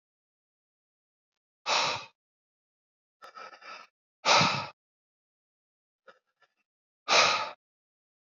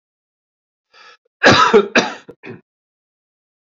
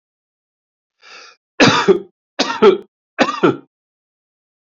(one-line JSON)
{"exhalation_length": "8.3 s", "exhalation_amplitude": 12824, "exhalation_signal_mean_std_ratio": 0.29, "cough_length": "3.7 s", "cough_amplitude": 29635, "cough_signal_mean_std_ratio": 0.32, "three_cough_length": "4.7 s", "three_cough_amplitude": 30657, "three_cough_signal_mean_std_ratio": 0.34, "survey_phase": "beta (2021-08-13 to 2022-03-07)", "age": "45-64", "gender": "Male", "wearing_mask": "No", "symptom_cough_any": true, "symptom_runny_or_blocked_nose": true, "symptom_shortness_of_breath": true, "symptom_onset": "13 days", "smoker_status": "Never smoked", "respiratory_condition_asthma": false, "respiratory_condition_other": false, "recruitment_source": "REACT", "submission_delay": "0 days", "covid_test_result": "Positive", "covid_test_method": "RT-qPCR", "covid_ct_value": 31.4, "covid_ct_gene": "N gene", "influenza_a_test_result": "Negative", "influenza_b_test_result": "Negative"}